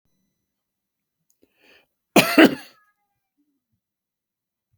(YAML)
cough_length: 4.8 s
cough_amplitude: 30817
cough_signal_mean_std_ratio: 0.18
survey_phase: beta (2021-08-13 to 2022-03-07)
age: 65+
gender: Male
wearing_mask: 'No'
symptom_none: true
smoker_status: Never smoked
respiratory_condition_asthma: false
respiratory_condition_other: false
recruitment_source: REACT
submission_delay: 2 days
covid_test_result: Negative
covid_test_method: RT-qPCR
influenza_a_test_result: Negative
influenza_b_test_result: Negative